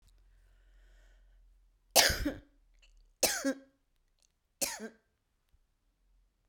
{"three_cough_length": "6.5 s", "three_cough_amplitude": 14472, "three_cough_signal_mean_std_ratio": 0.27, "survey_phase": "beta (2021-08-13 to 2022-03-07)", "age": "45-64", "gender": "Female", "wearing_mask": "No", "symptom_cough_any": true, "symptom_runny_or_blocked_nose": true, "symptom_shortness_of_breath": true, "symptom_sore_throat": true, "symptom_fatigue": true, "symptom_change_to_sense_of_smell_or_taste": true, "symptom_loss_of_taste": true, "symptom_onset": "3 days", "smoker_status": "Never smoked", "respiratory_condition_asthma": false, "respiratory_condition_other": false, "recruitment_source": "Test and Trace", "submission_delay": "2 days", "covid_test_result": "Positive", "covid_test_method": "ePCR"}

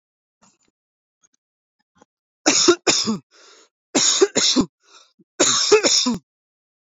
{"cough_length": "6.9 s", "cough_amplitude": 26909, "cough_signal_mean_std_ratio": 0.43, "survey_phase": "beta (2021-08-13 to 2022-03-07)", "age": "18-44", "gender": "Male", "wearing_mask": "No", "symptom_none": true, "smoker_status": "Never smoked", "respiratory_condition_asthma": false, "respiratory_condition_other": false, "recruitment_source": "REACT", "submission_delay": "1 day", "covid_test_result": "Negative", "covid_test_method": "RT-qPCR"}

